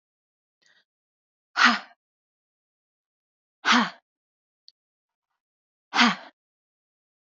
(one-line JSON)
{"exhalation_length": "7.3 s", "exhalation_amplitude": 20415, "exhalation_signal_mean_std_ratio": 0.23, "survey_phase": "beta (2021-08-13 to 2022-03-07)", "age": "18-44", "gender": "Female", "wearing_mask": "No", "symptom_none": true, "symptom_onset": "8 days", "smoker_status": "Never smoked", "respiratory_condition_asthma": false, "respiratory_condition_other": false, "recruitment_source": "REACT", "submission_delay": "2 days", "covid_test_result": "Negative", "covid_test_method": "RT-qPCR", "influenza_a_test_result": "Negative", "influenza_b_test_result": "Negative"}